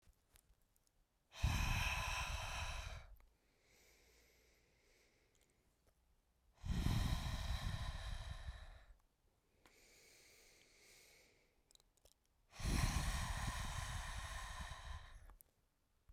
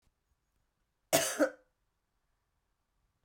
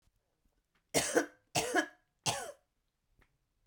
{
  "exhalation_length": "16.1 s",
  "exhalation_amplitude": 1861,
  "exhalation_signal_mean_std_ratio": 0.52,
  "cough_length": "3.2 s",
  "cough_amplitude": 8959,
  "cough_signal_mean_std_ratio": 0.24,
  "three_cough_length": "3.7 s",
  "three_cough_amplitude": 6793,
  "three_cough_signal_mean_std_ratio": 0.35,
  "survey_phase": "beta (2021-08-13 to 2022-03-07)",
  "age": "45-64",
  "gender": "Female",
  "wearing_mask": "No",
  "symptom_cough_any": true,
  "symptom_shortness_of_breath": true,
  "symptom_sore_throat": true,
  "symptom_abdominal_pain": true,
  "symptom_fatigue": true,
  "symptom_headache": true,
  "symptom_change_to_sense_of_smell_or_taste": true,
  "symptom_loss_of_taste": true,
  "symptom_onset": "3 days",
  "smoker_status": "Never smoked",
  "respiratory_condition_asthma": false,
  "respiratory_condition_other": false,
  "recruitment_source": "Test and Trace",
  "submission_delay": "2 days",
  "covid_test_result": "Positive",
  "covid_test_method": "RT-qPCR",
  "covid_ct_value": 20.7,
  "covid_ct_gene": "ORF1ab gene"
}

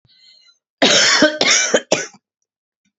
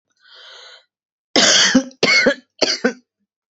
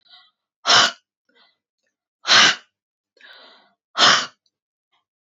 {
  "cough_length": "3.0 s",
  "cough_amplitude": 29653,
  "cough_signal_mean_std_ratio": 0.49,
  "three_cough_length": "3.5 s",
  "three_cough_amplitude": 32767,
  "three_cough_signal_mean_std_ratio": 0.46,
  "exhalation_length": "5.2 s",
  "exhalation_amplitude": 29476,
  "exhalation_signal_mean_std_ratio": 0.31,
  "survey_phase": "beta (2021-08-13 to 2022-03-07)",
  "age": "65+",
  "gender": "Female",
  "wearing_mask": "No",
  "symptom_none": true,
  "smoker_status": "Never smoked",
  "respiratory_condition_asthma": false,
  "respiratory_condition_other": false,
  "recruitment_source": "REACT",
  "submission_delay": "3 days",
  "covid_test_result": "Negative",
  "covid_test_method": "RT-qPCR",
  "influenza_a_test_result": "Negative",
  "influenza_b_test_result": "Negative"
}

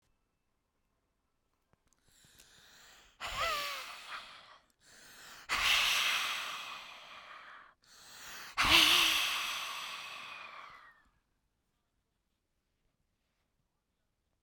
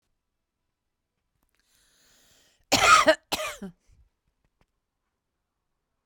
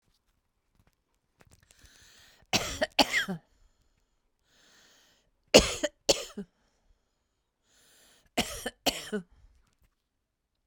{
  "exhalation_length": "14.4 s",
  "exhalation_amplitude": 10162,
  "exhalation_signal_mean_std_ratio": 0.39,
  "cough_length": "6.1 s",
  "cough_amplitude": 20261,
  "cough_signal_mean_std_ratio": 0.23,
  "three_cough_length": "10.7 s",
  "three_cough_amplitude": 25817,
  "three_cough_signal_mean_std_ratio": 0.23,
  "survey_phase": "beta (2021-08-13 to 2022-03-07)",
  "age": "65+",
  "gender": "Female",
  "wearing_mask": "No",
  "symptom_none": true,
  "smoker_status": "Never smoked",
  "respiratory_condition_asthma": true,
  "respiratory_condition_other": false,
  "recruitment_source": "Test and Trace",
  "submission_delay": "1 day",
  "covid_test_result": "Positive",
  "covid_test_method": "RT-qPCR",
  "covid_ct_value": 33.8,
  "covid_ct_gene": "ORF1ab gene"
}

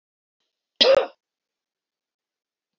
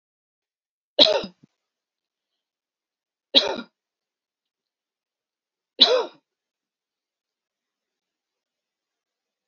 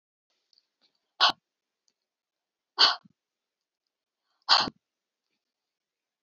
{
  "cough_length": "2.8 s",
  "cough_amplitude": 27224,
  "cough_signal_mean_std_ratio": 0.23,
  "three_cough_length": "9.5 s",
  "three_cough_amplitude": 32673,
  "three_cough_signal_mean_std_ratio": 0.19,
  "exhalation_length": "6.2 s",
  "exhalation_amplitude": 16622,
  "exhalation_signal_mean_std_ratio": 0.2,
  "survey_phase": "beta (2021-08-13 to 2022-03-07)",
  "age": "45-64",
  "gender": "Female",
  "wearing_mask": "No",
  "symptom_none": true,
  "smoker_status": "Never smoked",
  "respiratory_condition_asthma": false,
  "respiratory_condition_other": false,
  "recruitment_source": "REACT",
  "submission_delay": "1 day",
  "covid_test_result": "Negative",
  "covid_test_method": "RT-qPCR"
}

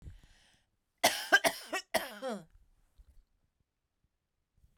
{
  "three_cough_length": "4.8 s",
  "three_cough_amplitude": 8505,
  "three_cough_signal_mean_std_ratio": 0.27,
  "survey_phase": "beta (2021-08-13 to 2022-03-07)",
  "age": "45-64",
  "gender": "Female",
  "wearing_mask": "No",
  "symptom_none": true,
  "smoker_status": "Never smoked",
  "respiratory_condition_asthma": false,
  "respiratory_condition_other": false,
  "recruitment_source": "REACT",
  "submission_delay": "2 days",
  "covid_test_result": "Negative",
  "covid_test_method": "RT-qPCR"
}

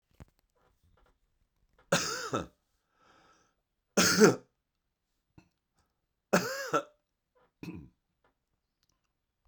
{
  "three_cough_length": "9.5 s",
  "three_cough_amplitude": 16877,
  "three_cough_signal_mean_std_ratio": 0.25,
  "survey_phase": "beta (2021-08-13 to 2022-03-07)",
  "age": "45-64",
  "gender": "Male",
  "wearing_mask": "No",
  "symptom_cough_any": true,
  "symptom_runny_or_blocked_nose": true,
  "symptom_sore_throat": true,
  "symptom_fatigue": true,
  "symptom_headache": true,
  "symptom_onset": "5 days",
  "smoker_status": "Ex-smoker",
  "respiratory_condition_asthma": false,
  "respiratory_condition_other": false,
  "recruitment_source": "Test and Trace",
  "submission_delay": "2 days",
  "covid_test_result": "Positive",
  "covid_test_method": "RT-qPCR",
  "covid_ct_value": 14.7,
  "covid_ct_gene": "N gene"
}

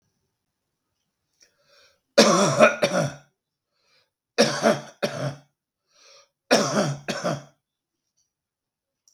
{
  "three_cough_length": "9.1 s",
  "three_cough_amplitude": 32766,
  "three_cough_signal_mean_std_ratio": 0.35,
  "survey_phase": "beta (2021-08-13 to 2022-03-07)",
  "age": "45-64",
  "gender": "Male",
  "wearing_mask": "No",
  "symptom_none": true,
  "smoker_status": "Ex-smoker",
  "respiratory_condition_asthma": false,
  "respiratory_condition_other": false,
  "recruitment_source": "REACT",
  "submission_delay": "2 days",
  "covid_test_result": "Negative",
  "covid_test_method": "RT-qPCR",
  "influenza_a_test_result": "Negative",
  "influenza_b_test_result": "Negative"
}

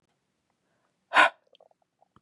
{
  "exhalation_length": "2.2 s",
  "exhalation_amplitude": 19344,
  "exhalation_signal_mean_std_ratio": 0.2,
  "survey_phase": "beta (2021-08-13 to 2022-03-07)",
  "age": "45-64",
  "gender": "Female",
  "wearing_mask": "No",
  "symptom_none": true,
  "smoker_status": "Never smoked",
  "respiratory_condition_asthma": false,
  "respiratory_condition_other": false,
  "recruitment_source": "REACT",
  "submission_delay": "1 day",
  "covid_test_result": "Negative",
  "covid_test_method": "RT-qPCR",
  "influenza_a_test_result": "Negative",
  "influenza_b_test_result": "Negative"
}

